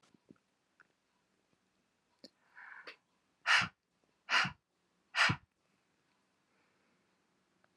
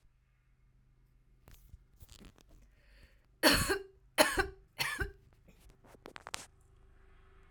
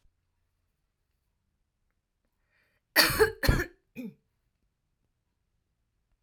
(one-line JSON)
{"exhalation_length": "7.8 s", "exhalation_amplitude": 5538, "exhalation_signal_mean_std_ratio": 0.23, "three_cough_length": "7.5 s", "three_cough_amplitude": 11333, "three_cough_signal_mean_std_ratio": 0.29, "cough_length": "6.2 s", "cough_amplitude": 19154, "cough_signal_mean_std_ratio": 0.23, "survey_phase": "alpha (2021-03-01 to 2021-08-12)", "age": "45-64", "gender": "Female", "wearing_mask": "No", "symptom_none": true, "smoker_status": "Ex-smoker", "respiratory_condition_asthma": false, "respiratory_condition_other": false, "recruitment_source": "REACT", "submission_delay": "1 day", "covid_test_result": "Negative", "covid_test_method": "RT-qPCR"}